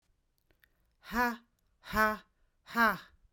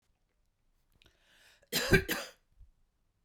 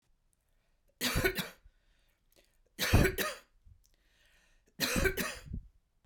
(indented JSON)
{
  "exhalation_length": "3.3 s",
  "exhalation_amplitude": 7479,
  "exhalation_signal_mean_std_ratio": 0.35,
  "cough_length": "3.2 s",
  "cough_amplitude": 9809,
  "cough_signal_mean_std_ratio": 0.25,
  "three_cough_length": "6.1 s",
  "three_cough_amplitude": 7530,
  "three_cough_signal_mean_std_ratio": 0.38,
  "survey_phase": "beta (2021-08-13 to 2022-03-07)",
  "age": "45-64",
  "gender": "Female",
  "wearing_mask": "No",
  "symptom_none": true,
  "symptom_onset": "11 days",
  "smoker_status": "Never smoked",
  "respiratory_condition_asthma": false,
  "respiratory_condition_other": false,
  "recruitment_source": "REACT",
  "submission_delay": "2 days",
  "covid_test_result": "Negative",
  "covid_test_method": "RT-qPCR",
  "influenza_a_test_result": "Unknown/Void",
  "influenza_b_test_result": "Unknown/Void"
}